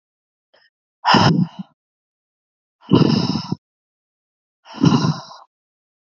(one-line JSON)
{"exhalation_length": "6.1 s", "exhalation_amplitude": 32767, "exhalation_signal_mean_std_ratio": 0.36, "survey_phase": "beta (2021-08-13 to 2022-03-07)", "age": "18-44", "gender": "Female", "wearing_mask": "No", "symptom_cough_any": true, "symptom_sore_throat": true, "symptom_onset": "3 days", "smoker_status": "Never smoked", "respiratory_condition_asthma": false, "respiratory_condition_other": false, "recruitment_source": "Test and Trace", "submission_delay": "2 days", "covid_test_result": "Positive", "covid_test_method": "ePCR"}